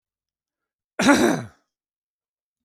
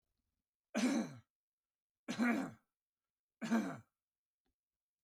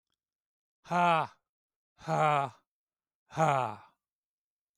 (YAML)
cough_length: 2.6 s
cough_amplitude: 23785
cough_signal_mean_std_ratio: 0.31
three_cough_length: 5.0 s
three_cough_amplitude: 2197
three_cough_signal_mean_std_ratio: 0.38
exhalation_length: 4.8 s
exhalation_amplitude: 7259
exhalation_signal_mean_std_ratio: 0.38
survey_phase: beta (2021-08-13 to 2022-03-07)
age: 65+
gender: Male
wearing_mask: 'No'
symptom_runny_or_blocked_nose: true
symptom_shortness_of_breath: true
symptom_fatigue: true
symptom_onset: 12 days
smoker_status: Ex-smoker
respiratory_condition_asthma: false
respiratory_condition_other: false
recruitment_source: REACT
submission_delay: 0 days
covid_test_result: Negative
covid_test_method: RT-qPCR